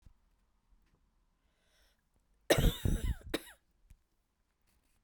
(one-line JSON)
{"cough_length": "5.0 s", "cough_amplitude": 8590, "cough_signal_mean_std_ratio": 0.26, "survey_phase": "beta (2021-08-13 to 2022-03-07)", "age": "18-44", "gender": "Female", "wearing_mask": "No", "symptom_cough_any": true, "symptom_runny_or_blocked_nose": true, "symptom_fatigue": true, "symptom_headache": true, "smoker_status": "Never smoked", "respiratory_condition_asthma": false, "respiratory_condition_other": false, "recruitment_source": "Test and Trace", "submission_delay": "2 days", "covid_test_result": "Positive", "covid_test_method": "RT-qPCR"}